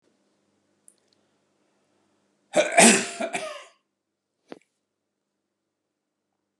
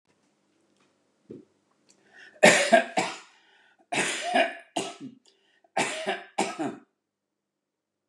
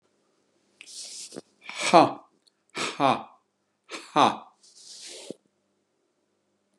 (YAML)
cough_length: 6.6 s
cough_amplitude: 27586
cough_signal_mean_std_ratio: 0.22
three_cough_length: 8.1 s
three_cough_amplitude: 24263
three_cough_signal_mean_std_ratio: 0.34
exhalation_length: 6.8 s
exhalation_amplitude: 26856
exhalation_signal_mean_std_ratio: 0.26
survey_phase: beta (2021-08-13 to 2022-03-07)
age: 65+
gender: Male
wearing_mask: 'No'
symptom_none: true
smoker_status: Never smoked
respiratory_condition_asthma: false
respiratory_condition_other: false
recruitment_source: REACT
submission_delay: 1 day
covid_test_result: Negative
covid_test_method: RT-qPCR
influenza_a_test_result: Negative
influenza_b_test_result: Negative